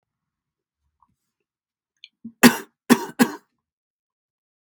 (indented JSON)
{
  "cough_length": "4.6 s",
  "cough_amplitude": 32768,
  "cough_signal_mean_std_ratio": 0.18,
  "survey_phase": "beta (2021-08-13 to 2022-03-07)",
  "age": "45-64",
  "gender": "Male",
  "wearing_mask": "No",
  "symptom_cough_any": true,
  "symptom_diarrhoea": true,
  "symptom_headache": true,
  "symptom_onset": "2 days",
  "smoker_status": "Ex-smoker",
  "respiratory_condition_asthma": false,
  "respiratory_condition_other": false,
  "recruitment_source": "Test and Trace",
  "submission_delay": "1 day",
  "covid_test_result": "Positive",
  "covid_test_method": "RT-qPCR",
  "covid_ct_value": 15.9,
  "covid_ct_gene": "ORF1ab gene"
}